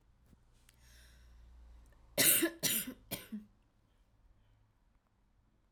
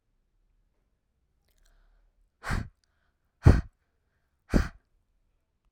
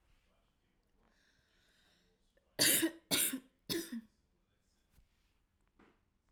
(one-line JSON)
{"cough_length": "5.7 s", "cough_amplitude": 6436, "cough_signal_mean_std_ratio": 0.3, "exhalation_length": "5.7 s", "exhalation_amplitude": 23017, "exhalation_signal_mean_std_ratio": 0.18, "three_cough_length": "6.3 s", "three_cough_amplitude": 4842, "three_cough_signal_mean_std_ratio": 0.28, "survey_phase": "alpha (2021-03-01 to 2021-08-12)", "age": "18-44", "gender": "Female", "wearing_mask": "No", "symptom_none": true, "smoker_status": "Never smoked", "respiratory_condition_asthma": true, "respiratory_condition_other": false, "recruitment_source": "REACT", "submission_delay": "1 day", "covid_test_result": "Negative", "covid_test_method": "RT-qPCR"}